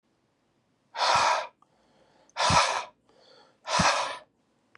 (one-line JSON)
{"exhalation_length": "4.8 s", "exhalation_amplitude": 12619, "exhalation_signal_mean_std_ratio": 0.45, "survey_phase": "beta (2021-08-13 to 2022-03-07)", "age": "18-44", "gender": "Male", "wearing_mask": "No", "symptom_cough_any": true, "symptom_new_continuous_cough": true, "symptom_runny_or_blocked_nose": true, "symptom_sore_throat": true, "symptom_fatigue": true, "symptom_headache": true, "symptom_onset": "2 days", "smoker_status": "Never smoked", "respiratory_condition_asthma": false, "respiratory_condition_other": false, "recruitment_source": "Test and Trace", "submission_delay": "1 day", "covid_test_result": "Negative", "covid_test_method": "RT-qPCR"}